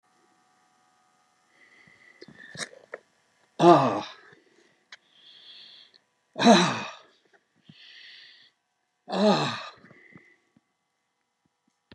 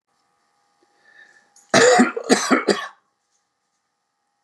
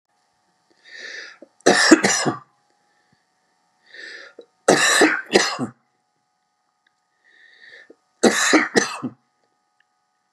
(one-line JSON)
{"exhalation_length": "11.9 s", "exhalation_amplitude": 22130, "exhalation_signal_mean_std_ratio": 0.26, "cough_length": "4.4 s", "cough_amplitude": 31920, "cough_signal_mean_std_ratio": 0.34, "three_cough_length": "10.3 s", "three_cough_amplitude": 32768, "three_cough_signal_mean_std_ratio": 0.35, "survey_phase": "beta (2021-08-13 to 2022-03-07)", "age": "65+", "gender": "Male", "wearing_mask": "No", "symptom_none": true, "smoker_status": "Never smoked", "respiratory_condition_asthma": false, "respiratory_condition_other": false, "recruitment_source": "REACT", "submission_delay": "0 days", "covid_test_result": "Negative", "covid_test_method": "RT-qPCR"}